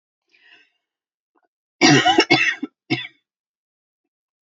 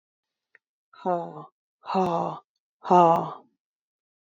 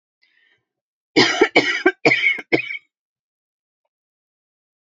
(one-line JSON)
{"cough_length": "4.4 s", "cough_amplitude": 28887, "cough_signal_mean_std_ratio": 0.32, "exhalation_length": "4.4 s", "exhalation_amplitude": 18657, "exhalation_signal_mean_std_ratio": 0.34, "three_cough_length": "4.9 s", "three_cough_amplitude": 32768, "three_cough_signal_mean_std_ratio": 0.35, "survey_phase": "beta (2021-08-13 to 2022-03-07)", "age": "18-44", "gender": "Female", "wearing_mask": "No", "symptom_none": true, "symptom_onset": "2 days", "smoker_status": "Never smoked", "respiratory_condition_asthma": false, "respiratory_condition_other": false, "recruitment_source": "REACT", "submission_delay": "1 day", "covid_test_result": "Negative", "covid_test_method": "RT-qPCR", "influenza_a_test_result": "Negative", "influenza_b_test_result": "Negative"}